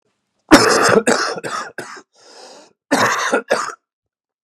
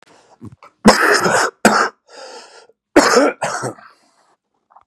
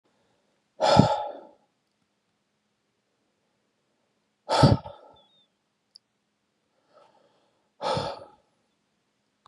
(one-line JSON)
{"three_cough_length": "4.4 s", "three_cough_amplitude": 32768, "three_cough_signal_mean_std_ratio": 0.47, "cough_length": "4.9 s", "cough_amplitude": 32768, "cough_signal_mean_std_ratio": 0.44, "exhalation_length": "9.5 s", "exhalation_amplitude": 30121, "exhalation_signal_mean_std_ratio": 0.24, "survey_phase": "beta (2021-08-13 to 2022-03-07)", "age": "45-64", "gender": "Male", "wearing_mask": "No", "symptom_cough_any": true, "symptom_new_continuous_cough": true, "symptom_runny_or_blocked_nose": true, "symptom_onset": "7 days", "smoker_status": "Never smoked", "respiratory_condition_asthma": false, "respiratory_condition_other": false, "recruitment_source": "Test and Trace", "submission_delay": "1 day", "covid_test_result": "Negative", "covid_test_method": "RT-qPCR"}